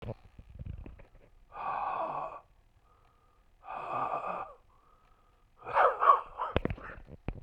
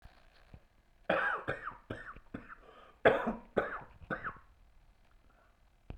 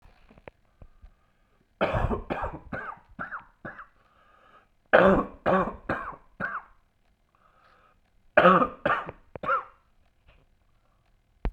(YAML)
exhalation_length: 7.4 s
exhalation_amplitude: 12234
exhalation_signal_mean_std_ratio: 0.42
cough_length: 6.0 s
cough_amplitude: 9742
cough_signal_mean_std_ratio: 0.37
three_cough_length: 11.5 s
three_cough_amplitude: 22705
three_cough_signal_mean_std_ratio: 0.34
survey_phase: beta (2021-08-13 to 2022-03-07)
age: 45-64
gender: Male
wearing_mask: 'No'
symptom_cough_any: true
symptom_new_continuous_cough: true
symptom_runny_or_blocked_nose: true
symptom_sore_throat: true
symptom_fatigue: true
symptom_fever_high_temperature: true
symptom_loss_of_taste: true
symptom_onset: 3 days
smoker_status: Never smoked
respiratory_condition_asthma: false
respiratory_condition_other: false
recruitment_source: Test and Trace
submission_delay: 1 day
covid_test_result: Positive
covid_test_method: RT-qPCR
covid_ct_value: 15.3
covid_ct_gene: ORF1ab gene
covid_ct_mean: 15.7
covid_viral_load: 6800000 copies/ml
covid_viral_load_category: High viral load (>1M copies/ml)